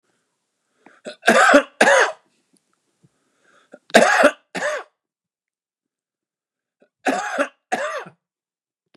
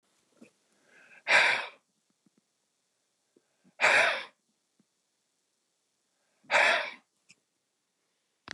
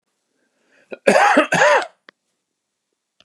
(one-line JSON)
{"three_cough_length": "9.0 s", "three_cough_amplitude": 29204, "three_cough_signal_mean_std_ratio": 0.33, "exhalation_length": "8.5 s", "exhalation_amplitude": 11007, "exhalation_signal_mean_std_ratio": 0.29, "cough_length": "3.2 s", "cough_amplitude": 29204, "cough_signal_mean_std_ratio": 0.39, "survey_phase": "beta (2021-08-13 to 2022-03-07)", "age": "65+", "gender": "Male", "wearing_mask": "No", "symptom_none": true, "smoker_status": "Ex-smoker", "respiratory_condition_asthma": false, "respiratory_condition_other": false, "recruitment_source": "REACT", "submission_delay": "1 day", "covid_test_result": "Negative", "covid_test_method": "RT-qPCR", "influenza_a_test_result": "Negative", "influenza_b_test_result": "Negative"}